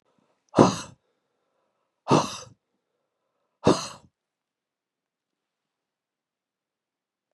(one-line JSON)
{"exhalation_length": "7.3 s", "exhalation_amplitude": 30617, "exhalation_signal_mean_std_ratio": 0.2, "survey_phase": "beta (2021-08-13 to 2022-03-07)", "age": "65+", "gender": "Male", "wearing_mask": "No", "symptom_cough_any": true, "symptom_runny_or_blocked_nose": true, "symptom_fatigue": true, "symptom_fever_high_temperature": true, "symptom_headache": true, "symptom_change_to_sense_of_smell_or_taste": true, "symptom_loss_of_taste": true, "symptom_onset": "4 days", "smoker_status": "Ex-smoker", "respiratory_condition_asthma": false, "respiratory_condition_other": false, "recruitment_source": "Test and Trace", "submission_delay": "1 day", "covid_test_result": "Positive", "covid_test_method": "ePCR"}